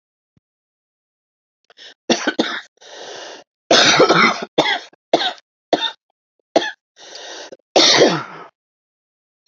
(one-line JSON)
{"cough_length": "9.5 s", "cough_amplitude": 32768, "cough_signal_mean_std_ratio": 0.39, "survey_phase": "alpha (2021-03-01 to 2021-08-12)", "age": "65+", "gender": "Female", "wearing_mask": "No", "symptom_cough_any": true, "symptom_shortness_of_breath": true, "smoker_status": "Never smoked", "respiratory_condition_asthma": false, "respiratory_condition_other": false, "recruitment_source": "REACT", "submission_delay": "2 days", "covid_test_result": "Negative", "covid_test_method": "RT-qPCR"}